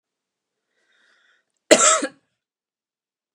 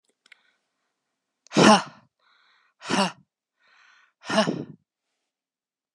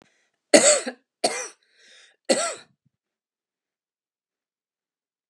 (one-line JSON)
{"cough_length": "3.3 s", "cough_amplitude": 32767, "cough_signal_mean_std_ratio": 0.23, "exhalation_length": "5.9 s", "exhalation_amplitude": 25971, "exhalation_signal_mean_std_ratio": 0.26, "three_cough_length": "5.3 s", "three_cough_amplitude": 32530, "three_cough_signal_mean_std_ratio": 0.25, "survey_phase": "beta (2021-08-13 to 2022-03-07)", "age": "18-44", "gender": "Female", "wearing_mask": "No", "symptom_runny_or_blocked_nose": true, "symptom_onset": "12 days", "smoker_status": "Never smoked", "respiratory_condition_asthma": false, "respiratory_condition_other": false, "recruitment_source": "REACT", "submission_delay": "1 day", "covid_test_result": "Negative", "covid_test_method": "RT-qPCR"}